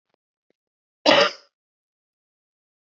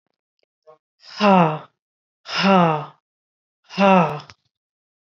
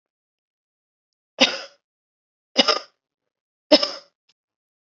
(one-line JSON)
{"cough_length": "2.8 s", "cough_amplitude": 29217, "cough_signal_mean_std_ratio": 0.23, "exhalation_length": "5.0 s", "exhalation_amplitude": 28917, "exhalation_signal_mean_std_ratio": 0.38, "three_cough_length": "4.9 s", "three_cough_amplitude": 30322, "three_cough_signal_mean_std_ratio": 0.22, "survey_phase": "beta (2021-08-13 to 2022-03-07)", "age": "45-64", "gender": "Male", "wearing_mask": "No", "symptom_change_to_sense_of_smell_or_taste": true, "symptom_loss_of_taste": true, "smoker_status": "Never smoked", "respiratory_condition_asthma": false, "respiratory_condition_other": false, "recruitment_source": "Test and Trace", "submission_delay": "1 day", "covid_test_result": "Negative", "covid_test_method": "ePCR"}